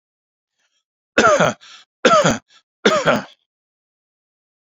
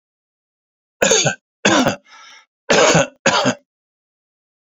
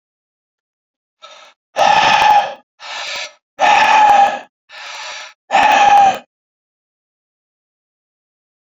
{
  "three_cough_length": "4.6 s",
  "three_cough_amplitude": 30790,
  "three_cough_signal_mean_std_ratio": 0.37,
  "cough_length": "4.6 s",
  "cough_amplitude": 31205,
  "cough_signal_mean_std_ratio": 0.43,
  "exhalation_length": "8.7 s",
  "exhalation_amplitude": 29972,
  "exhalation_signal_mean_std_ratio": 0.47,
  "survey_phase": "beta (2021-08-13 to 2022-03-07)",
  "age": "45-64",
  "gender": "Male",
  "wearing_mask": "No",
  "symptom_fatigue": true,
  "symptom_headache": true,
  "smoker_status": "Ex-smoker",
  "respiratory_condition_asthma": false,
  "respiratory_condition_other": false,
  "recruitment_source": "Test and Trace",
  "submission_delay": "2 days",
  "covid_test_result": "Positive",
  "covid_test_method": "RT-qPCR",
  "covid_ct_value": 31.3,
  "covid_ct_gene": "ORF1ab gene",
  "covid_ct_mean": 33.7,
  "covid_viral_load": "8.6 copies/ml",
  "covid_viral_load_category": "Minimal viral load (< 10K copies/ml)"
}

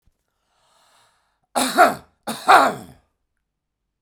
{
  "cough_length": "4.0 s",
  "cough_amplitude": 32768,
  "cough_signal_mean_std_ratio": 0.3,
  "survey_phase": "beta (2021-08-13 to 2022-03-07)",
  "age": "45-64",
  "gender": "Male",
  "wearing_mask": "No",
  "symptom_none": true,
  "smoker_status": "Ex-smoker",
  "respiratory_condition_asthma": false,
  "respiratory_condition_other": false,
  "recruitment_source": "REACT",
  "submission_delay": "1 day",
  "covid_test_result": "Negative",
  "covid_test_method": "RT-qPCR"
}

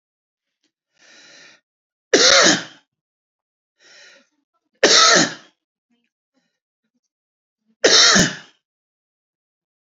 {
  "three_cough_length": "9.8 s",
  "three_cough_amplitude": 32767,
  "three_cough_signal_mean_std_ratio": 0.31,
  "survey_phase": "beta (2021-08-13 to 2022-03-07)",
  "age": "45-64",
  "gender": "Male",
  "wearing_mask": "No",
  "symptom_none": true,
  "smoker_status": "Never smoked",
  "respiratory_condition_asthma": false,
  "respiratory_condition_other": false,
  "recruitment_source": "REACT",
  "submission_delay": "1 day",
  "covid_test_result": "Negative",
  "covid_test_method": "RT-qPCR",
  "influenza_a_test_result": "Negative",
  "influenza_b_test_result": "Negative"
}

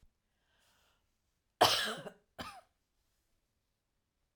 {
  "cough_length": "4.4 s",
  "cough_amplitude": 8734,
  "cough_signal_mean_std_ratio": 0.22,
  "survey_phase": "alpha (2021-03-01 to 2021-08-12)",
  "age": "45-64",
  "gender": "Female",
  "wearing_mask": "No",
  "symptom_none": true,
  "smoker_status": "Never smoked",
  "respiratory_condition_asthma": false,
  "respiratory_condition_other": false,
  "recruitment_source": "REACT",
  "submission_delay": "0 days",
  "covid_test_result": "Negative",
  "covid_test_method": "RT-qPCR"
}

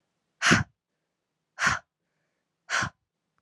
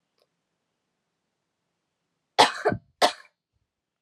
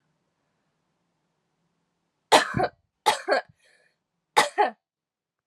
{
  "exhalation_length": "3.4 s",
  "exhalation_amplitude": 15384,
  "exhalation_signal_mean_std_ratio": 0.3,
  "cough_length": "4.0 s",
  "cough_amplitude": 24157,
  "cough_signal_mean_std_ratio": 0.21,
  "three_cough_length": "5.5 s",
  "three_cough_amplitude": 24896,
  "three_cough_signal_mean_std_ratio": 0.27,
  "survey_phase": "alpha (2021-03-01 to 2021-08-12)",
  "age": "18-44",
  "gender": "Female",
  "wearing_mask": "No",
  "symptom_cough_any": true,
  "symptom_new_continuous_cough": true,
  "symptom_shortness_of_breath": true,
  "symptom_abdominal_pain": true,
  "symptom_fatigue": true,
  "symptom_fever_high_temperature": true,
  "symptom_headache": true,
  "symptom_change_to_sense_of_smell_or_taste": true,
  "symptom_onset": "3 days",
  "smoker_status": "Never smoked",
  "respiratory_condition_asthma": false,
  "respiratory_condition_other": false,
  "recruitment_source": "Test and Trace",
  "submission_delay": "1 day",
  "covid_test_result": "Positive",
  "covid_test_method": "RT-qPCR"
}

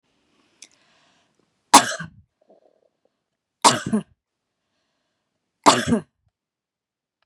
{
  "three_cough_length": "7.3 s",
  "three_cough_amplitude": 32768,
  "three_cough_signal_mean_std_ratio": 0.22,
  "survey_phase": "beta (2021-08-13 to 2022-03-07)",
  "age": "45-64",
  "gender": "Female",
  "wearing_mask": "No",
  "symptom_none": true,
  "smoker_status": "Ex-smoker",
  "respiratory_condition_asthma": false,
  "respiratory_condition_other": false,
  "recruitment_source": "REACT",
  "submission_delay": "2 days",
  "covid_test_result": "Negative",
  "covid_test_method": "RT-qPCR",
  "influenza_a_test_result": "Negative",
  "influenza_b_test_result": "Negative"
}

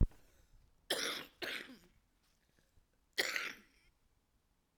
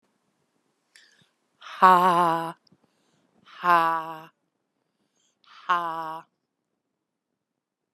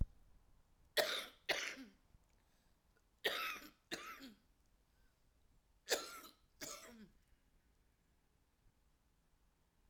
{
  "cough_length": "4.8 s",
  "cough_amplitude": 4865,
  "cough_signal_mean_std_ratio": 0.3,
  "exhalation_length": "7.9 s",
  "exhalation_amplitude": 28969,
  "exhalation_signal_mean_std_ratio": 0.29,
  "three_cough_length": "9.9 s",
  "three_cough_amplitude": 4686,
  "three_cough_signal_mean_std_ratio": 0.32,
  "survey_phase": "alpha (2021-03-01 to 2021-08-12)",
  "age": "45-64",
  "gender": "Female",
  "wearing_mask": "No",
  "symptom_prefer_not_to_say": true,
  "symptom_onset": "3 days",
  "smoker_status": "Current smoker (11 or more cigarettes per day)",
  "respiratory_condition_asthma": false,
  "respiratory_condition_other": false,
  "recruitment_source": "Test and Trace",
  "submission_delay": "1 day",
  "covid_test_result": "Positive",
  "covid_test_method": "RT-qPCR",
  "covid_ct_value": 19.3,
  "covid_ct_gene": "ORF1ab gene",
  "covid_ct_mean": 19.8,
  "covid_viral_load": "310000 copies/ml",
  "covid_viral_load_category": "Low viral load (10K-1M copies/ml)"
}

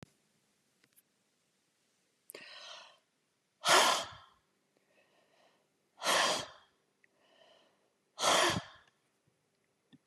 {
  "exhalation_length": "10.1 s",
  "exhalation_amplitude": 7805,
  "exhalation_signal_mean_std_ratio": 0.29,
  "survey_phase": "beta (2021-08-13 to 2022-03-07)",
  "age": "65+",
  "gender": "Female",
  "wearing_mask": "No",
  "symptom_none": true,
  "smoker_status": "Never smoked",
  "respiratory_condition_asthma": false,
  "respiratory_condition_other": true,
  "recruitment_source": "REACT",
  "submission_delay": "2 days",
  "covid_test_result": "Negative",
  "covid_test_method": "RT-qPCR",
  "influenza_a_test_result": "Unknown/Void",
  "influenza_b_test_result": "Unknown/Void"
}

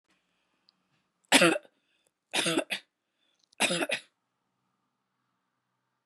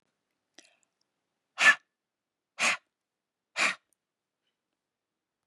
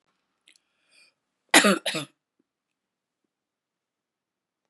{
  "three_cough_length": "6.1 s",
  "three_cough_amplitude": 20723,
  "three_cough_signal_mean_std_ratio": 0.28,
  "exhalation_length": "5.5 s",
  "exhalation_amplitude": 12998,
  "exhalation_signal_mean_std_ratio": 0.21,
  "cough_length": "4.7 s",
  "cough_amplitude": 24306,
  "cough_signal_mean_std_ratio": 0.19,
  "survey_phase": "beta (2021-08-13 to 2022-03-07)",
  "age": "45-64",
  "gender": "Female",
  "wearing_mask": "No",
  "symptom_none": true,
  "smoker_status": "Ex-smoker",
  "respiratory_condition_asthma": false,
  "respiratory_condition_other": false,
  "recruitment_source": "REACT",
  "submission_delay": "7 days",
  "covid_test_result": "Negative",
  "covid_test_method": "RT-qPCR",
  "influenza_a_test_result": "Negative",
  "influenza_b_test_result": "Negative"
}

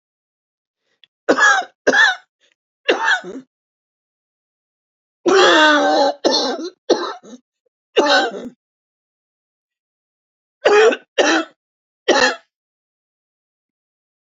{
  "three_cough_length": "14.3 s",
  "three_cough_amplitude": 30208,
  "three_cough_signal_mean_std_ratio": 0.41,
  "survey_phase": "beta (2021-08-13 to 2022-03-07)",
  "age": "65+",
  "gender": "Female",
  "wearing_mask": "No",
  "symptom_new_continuous_cough": true,
  "symptom_runny_or_blocked_nose": true,
  "symptom_shortness_of_breath": true,
  "symptom_sore_throat": true,
  "symptom_abdominal_pain": true,
  "symptom_fatigue": true,
  "symptom_fever_high_temperature": true,
  "symptom_headache": true,
  "symptom_change_to_sense_of_smell_or_taste": true,
  "symptom_onset": "4 days",
  "smoker_status": "Ex-smoker",
  "respiratory_condition_asthma": true,
  "respiratory_condition_other": false,
  "recruitment_source": "Test and Trace",
  "submission_delay": "1 day",
  "covid_test_result": "Positive",
  "covid_test_method": "RT-qPCR",
  "covid_ct_value": 15.4,
  "covid_ct_gene": "ORF1ab gene",
  "covid_ct_mean": 15.4,
  "covid_viral_load": "9000000 copies/ml",
  "covid_viral_load_category": "High viral load (>1M copies/ml)"
}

